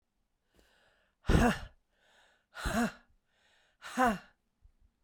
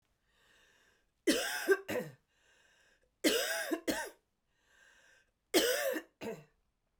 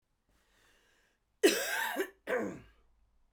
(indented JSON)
{
  "exhalation_length": "5.0 s",
  "exhalation_amplitude": 8203,
  "exhalation_signal_mean_std_ratio": 0.32,
  "three_cough_length": "7.0 s",
  "three_cough_amplitude": 5995,
  "three_cough_signal_mean_std_ratio": 0.41,
  "cough_length": "3.3 s",
  "cough_amplitude": 7532,
  "cough_signal_mean_std_ratio": 0.37,
  "survey_phase": "beta (2021-08-13 to 2022-03-07)",
  "age": "45-64",
  "gender": "Female",
  "wearing_mask": "No",
  "symptom_cough_any": true,
  "symptom_runny_or_blocked_nose": true,
  "symptom_shortness_of_breath": true,
  "symptom_sore_throat": true,
  "symptom_fatigue": true,
  "symptom_fever_high_temperature": true,
  "symptom_headache": true,
  "symptom_change_to_sense_of_smell_or_taste": true,
  "symptom_loss_of_taste": true,
  "symptom_other": true,
  "symptom_onset": "5 days",
  "smoker_status": "Ex-smoker",
  "respiratory_condition_asthma": false,
  "respiratory_condition_other": false,
  "recruitment_source": "Test and Trace",
  "submission_delay": "1 day",
  "covid_test_result": "Positive",
  "covid_test_method": "RT-qPCR"
}